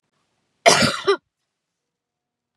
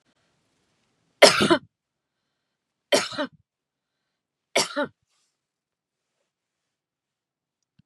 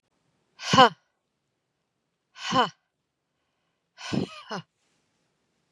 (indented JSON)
{
  "cough_length": "2.6 s",
  "cough_amplitude": 32739,
  "cough_signal_mean_std_ratio": 0.3,
  "three_cough_length": "7.9 s",
  "three_cough_amplitude": 32768,
  "three_cough_signal_mean_std_ratio": 0.21,
  "exhalation_length": "5.7 s",
  "exhalation_amplitude": 29092,
  "exhalation_signal_mean_std_ratio": 0.22,
  "survey_phase": "beta (2021-08-13 to 2022-03-07)",
  "age": "45-64",
  "gender": "Female",
  "wearing_mask": "No",
  "symptom_none": true,
  "smoker_status": "Never smoked",
  "respiratory_condition_asthma": false,
  "respiratory_condition_other": false,
  "recruitment_source": "REACT",
  "submission_delay": "2 days",
  "covid_test_result": "Negative",
  "covid_test_method": "RT-qPCR",
  "influenza_a_test_result": "Negative",
  "influenza_b_test_result": "Negative"
}